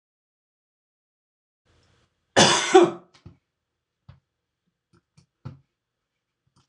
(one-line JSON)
{"cough_length": "6.7 s", "cough_amplitude": 26028, "cough_signal_mean_std_ratio": 0.21, "survey_phase": "beta (2021-08-13 to 2022-03-07)", "age": "45-64", "gender": "Male", "wearing_mask": "No", "symptom_sore_throat": true, "smoker_status": "Never smoked", "respiratory_condition_asthma": false, "respiratory_condition_other": false, "recruitment_source": "REACT", "submission_delay": "3 days", "covid_test_result": "Negative", "covid_test_method": "RT-qPCR"}